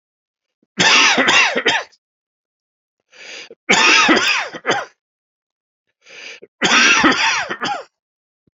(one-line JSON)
{"three_cough_length": "8.5 s", "three_cough_amplitude": 32768, "three_cough_signal_mean_std_ratio": 0.5, "survey_phase": "beta (2021-08-13 to 2022-03-07)", "age": "45-64", "gender": "Male", "wearing_mask": "No", "symptom_cough_any": true, "symptom_runny_or_blocked_nose": true, "symptom_fatigue": true, "symptom_headache": true, "symptom_onset": "3 days", "smoker_status": "Never smoked", "respiratory_condition_asthma": false, "respiratory_condition_other": false, "recruitment_source": "Test and Trace", "submission_delay": "1 day", "covid_test_result": "Positive", "covid_test_method": "RT-qPCR", "covid_ct_value": 20.3, "covid_ct_gene": "ORF1ab gene", "covid_ct_mean": 21.2, "covid_viral_load": "110000 copies/ml", "covid_viral_load_category": "Low viral load (10K-1M copies/ml)"}